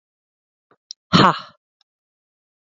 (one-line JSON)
{"exhalation_length": "2.7 s", "exhalation_amplitude": 28860, "exhalation_signal_mean_std_ratio": 0.22, "survey_phase": "beta (2021-08-13 to 2022-03-07)", "age": "45-64", "gender": "Female", "wearing_mask": "No", "symptom_none": true, "smoker_status": "Ex-smoker", "respiratory_condition_asthma": false, "respiratory_condition_other": false, "recruitment_source": "REACT", "submission_delay": "0 days", "covid_test_result": "Negative", "covid_test_method": "RT-qPCR", "influenza_a_test_result": "Negative", "influenza_b_test_result": "Negative"}